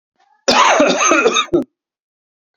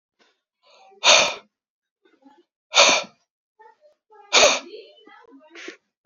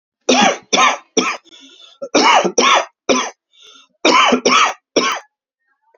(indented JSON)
{
  "cough_length": "2.6 s",
  "cough_amplitude": 31342,
  "cough_signal_mean_std_ratio": 0.58,
  "exhalation_length": "6.1 s",
  "exhalation_amplitude": 32767,
  "exhalation_signal_mean_std_ratio": 0.3,
  "three_cough_length": "6.0 s",
  "three_cough_amplitude": 32768,
  "three_cough_signal_mean_std_ratio": 0.54,
  "survey_phase": "beta (2021-08-13 to 2022-03-07)",
  "age": "18-44",
  "gender": "Male",
  "wearing_mask": "No",
  "symptom_none": true,
  "smoker_status": "Never smoked",
  "respiratory_condition_asthma": false,
  "respiratory_condition_other": false,
  "recruitment_source": "REACT",
  "submission_delay": "2 days",
  "covid_test_result": "Negative",
  "covid_test_method": "RT-qPCR"
}